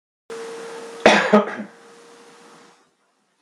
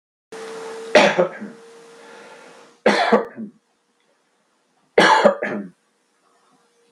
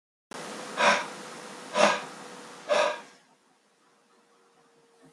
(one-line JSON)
{"cough_length": "3.4 s", "cough_amplitude": 32768, "cough_signal_mean_std_ratio": 0.33, "three_cough_length": "6.9 s", "three_cough_amplitude": 32768, "three_cough_signal_mean_std_ratio": 0.37, "exhalation_length": "5.1 s", "exhalation_amplitude": 14528, "exhalation_signal_mean_std_ratio": 0.4, "survey_phase": "beta (2021-08-13 to 2022-03-07)", "age": "45-64", "gender": "Male", "wearing_mask": "No", "symptom_none": true, "smoker_status": "Ex-smoker", "respiratory_condition_asthma": false, "respiratory_condition_other": false, "recruitment_source": "REACT", "submission_delay": "3 days", "covid_test_result": "Negative", "covid_test_method": "RT-qPCR", "influenza_a_test_result": "Negative", "influenza_b_test_result": "Negative"}